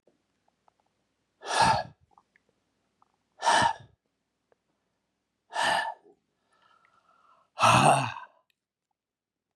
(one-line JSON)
{"exhalation_length": "9.6 s", "exhalation_amplitude": 14838, "exhalation_signal_mean_std_ratio": 0.31, "survey_phase": "beta (2021-08-13 to 2022-03-07)", "age": "65+", "gender": "Male", "wearing_mask": "No", "symptom_none": true, "smoker_status": "Ex-smoker", "respiratory_condition_asthma": false, "respiratory_condition_other": false, "recruitment_source": "REACT", "submission_delay": "3 days", "covid_test_result": "Negative", "covid_test_method": "RT-qPCR", "influenza_a_test_result": "Negative", "influenza_b_test_result": "Negative"}